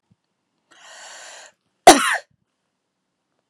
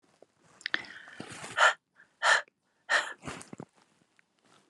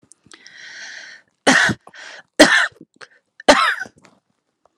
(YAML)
cough_length: 3.5 s
cough_amplitude: 32768
cough_signal_mean_std_ratio: 0.19
exhalation_length: 4.7 s
exhalation_amplitude: 10970
exhalation_signal_mean_std_ratio: 0.31
three_cough_length: 4.8 s
three_cough_amplitude: 32768
three_cough_signal_mean_std_ratio: 0.34
survey_phase: alpha (2021-03-01 to 2021-08-12)
age: 45-64
gender: Female
wearing_mask: 'No'
symptom_fatigue: true
symptom_onset: 9 days
smoker_status: Ex-smoker
respiratory_condition_asthma: false
respiratory_condition_other: false
recruitment_source: REACT
submission_delay: 1 day
covid_test_result: Negative
covid_test_method: RT-qPCR